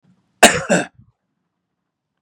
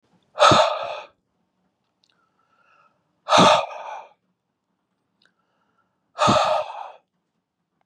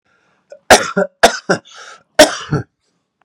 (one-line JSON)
{"cough_length": "2.2 s", "cough_amplitude": 32768, "cough_signal_mean_std_ratio": 0.26, "exhalation_length": "7.9 s", "exhalation_amplitude": 29997, "exhalation_signal_mean_std_ratio": 0.33, "three_cough_length": "3.2 s", "three_cough_amplitude": 32768, "three_cough_signal_mean_std_ratio": 0.34, "survey_phase": "beta (2021-08-13 to 2022-03-07)", "age": "45-64", "gender": "Male", "wearing_mask": "No", "symptom_none": true, "symptom_onset": "7 days", "smoker_status": "Ex-smoker", "respiratory_condition_asthma": false, "respiratory_condition_other": false, "recruitment_source": "REACT", "submission_delay": "1 day", "covid_test_result": "Negative", "covid_test_method": "RT-qPCR", "influenza_a_test_result": "Negative", "influenza_b_test_result": "Negative"}